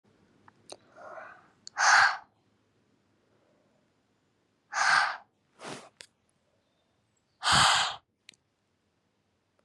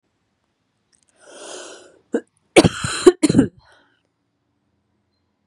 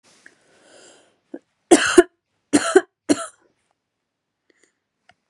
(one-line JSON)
{"exhalation_length": "9.6 s", "exhalation_amplitude": 11686, "exhalation_signal_mean_std_ratio": 0.3, "cough_length": "5.5 s", "cough_amplitude": 32768, "cough_signal_mean_std_ratio": 0.24, "three_cough_length": "5.3 s", "three_cough_amplitude": 32768, "three_cough_signal_mean_std_ratio": 0.23, "survey_phase": "beta (2021-08-13 to 2022-03-07)", "age": "18-44", "gender": "Female", "wearing_mask": "No", "symptom_cough_any": true, "symptom_new_continuous_cough": true, "symptom_runny_or_blocked_nose": true, "symptom_sore_throat": true, "symptom_fatigue": true, "symptom_headache": true, "smoker_status": "Current smoker (e-cigarettes or vapes only)", "respiratory_condition_asthma": false, "respiratory_condition_other": false, "recruitment_source": "Test and Trace", "submission_delay": "1 day", "covid_test_result": "Positive", "covid_test_method": "RT-qPCR", "covid_ct_value": 28.5, "covid_ct_gene": "N gene"}